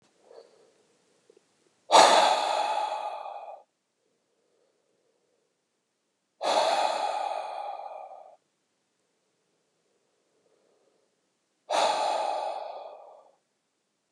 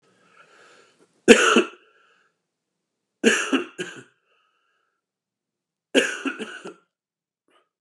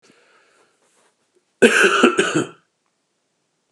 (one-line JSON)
{"exhalation_length": "14.1 s", "exhalation_amplitude": 21956, "exhalation_signal_mean_std_ratio": 0.37, "three_cough_length": "7.8 s", "three_cough_amplitude": 32768, "three_cough_signal_mean_std_ratio": 0.26, "cough_length": "3.7 s", "cough_amplitude": 32767, "cough_signal_mean_std_ratio": 0.35, "survey_phase": "beta (2021-08-13 to 2022-03-07)", "age": "45-64", "gender": "Male", "wearing_mask": "No", "symptom_none": true, "smoker_status": "Ex-smoker", "respiratory_condition_asthma": false, "respiratory_condition_other": false, "recruitment_source": "REACT", "submission_delay": "4 days", "covid_test_result": "Negative", "covid_test_method": "RT-qPCR", "influenza_a_test_result": "Negative", "influenza_b_test_result": "Negative"}